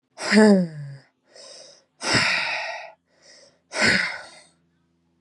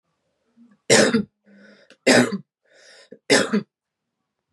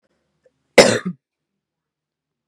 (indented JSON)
{
  "exhalation_length": "5.2 s",
  "exhalation_amplitude": 25033,
  "exhalation_signal_mean_std_ratio": 0.44,
  "three_cough_length": "4.5 s",
  "three_cough_amplitude": 29281,
  "three_cough_signal_mean_std_ratio": 0.35,
  "cough_length": "2.5 s",
  "cough_amplitude": 32768,
  "cough_signal_mean_std_ratio": 0.21,
  "survey_phase": "beta (2021-08-13 to 2022-03-07)",
  "age": "18-44",
  "gender": "Female",
  "wearing_mask": "No",
  "symptom_none": true,
  "smoker_status": "Never smoked",
  "respiratory_condition_asthma": false,
  "respiratory_condition_other": false,
  "recruitment_source": "REACT",
  "submission_delay": "2 days",
  "covid_test_result": "Negative",
  "covid_test_method": "RT-qPCR",
  "influenza_a_test_result": "Negative",
  "influenza_b_test_result": "Negative"
}